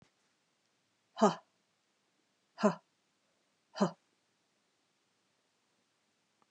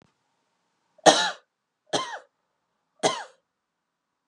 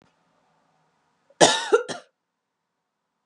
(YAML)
exhalation_length: 6.5 s
exhalation_amplitude: 8192
exhalation_signal_mean_std_ratio: 0.18
three_cough_length: 4.3 s
three_cough_amplitude: 31200
three_cough_signal_mean_std_ratio: 0.24
cough_length: 3.3 s
cough_amplitude: 32040
cough_signal_mean_std_ratio: 0.24
survey_phase: beta (2021-08-13 to 2022-03-07)
age: 18-44
gender: Female
wearing_mask: 'No'
symptom_runny_or_blocked_nose: true
symptom_fatigue: true
symptom_change_to_sense_of_smell_or_taste: true
smoker_status: Never smoked
respiratory_condition_asthma: false
respiratory_condition_other: false
recruitment_source: Test and Trace
submission_delay: 2 days
covid_test_result: Positive
covid_test_method: RT-qPCR
covid_ct_value: 23.0
covid_ct_gene: ORF1ab gene
covid_ct_mean: 24.4
covid_viral_load: 9900 copies/ml
covid_viral_load_category: Minimal viral load (< 10K copies/ml)